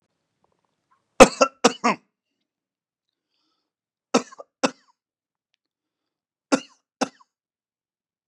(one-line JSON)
{"three_cough_length": "8.3 s", "three_cough_amplitude": 32768, "three_cough_signal_mean_std_ratio": 0.16, "survey_phase": "beta (2021-08-13 to 2022-03-07)", "age": "45-64", "gender": "Male", "wearing_mask": "No", "symptom_none": true, "smoker_status": "Ex-smoker", "respiratory_condition_asthma": false, "respiratory_condition_other": false, "recruitment_source": "REACT", "submission_delay": "3 days", "covid_test_result": "Negative", "covid_test_method": "RT-qPCR", "influenza_a_test_result": "Negative", "influenza_b_test_result": "Negative"}